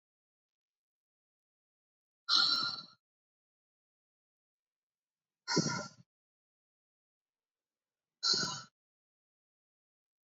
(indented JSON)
{
  "exhalation_length": "10.2 s",
  "exhalation_amplitude": 5955,
  "exhalation_signal_mean_std_ratio": 0.26,
  "survey_phase": "beta (2021-08-13 to 2022-03-07)",
  "age": "65+",
  "gender": "Female",
  "wearing_mask": "No",
  "symptom_none": true,
  "smoker_status": "Never smoked",
  "respiratory_condition_asthma": false,
  "respiratory_condition_other": false,
  "recruitment_source": "REACT",
  "submission_delay": "2 days",
  "covid_test_result": "Negative",
  "covid_test_method": "RT-qPCR",
  "influenza_a_test_result": "Negative",
  "influenza_b_test_result": "Negative"
}